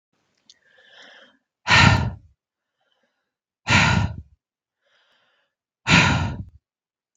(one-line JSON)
{"exhalation_length": "7.2 s", "exhalation_amplitude": 32768, "exhalation_signal_mean_std_ratio": 0.34, "survey_phase": "beta (2021-08-13 to 2022-03-07)", "age": "18-44", "gender": "Female", "wearing_mask": "No", "symptom_none": true, "smoker_status": "Never smoked", "respiratory_condition_asthma": false, "respiratory_condition_other": false, "recruitment_source": "REACT", "submission_delay": "1 day", "covid_test_result": "Negative", "covid_test_method": "RT-qPCR", "influenza_a_test_result": "Negative", "influenza_b_test_result": "Negative"}